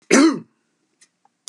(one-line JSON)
{"cough_length": "1.5 s", "cough_amplitude": 31746, "cough_signal_mean_std_ratio": 0.35, "survey_phase": "beta (2021-08-13 to 2022-03-07)", "age": "65+", "gender": "Male", "wearing_mask": "No", "symptom_none": true, "smoker_status": "Ex-smoker", "respiratory_condition_asthma": false, "respiratory_condition_other": false, "recruitment_source": "REACT", "submission_delay": "2 days", "covid_test_result": "Negative", "covid_test_method": "RT-qPCR", "influenza_a_test_result": "Negative", "influenza_b_test_result": "Negative"}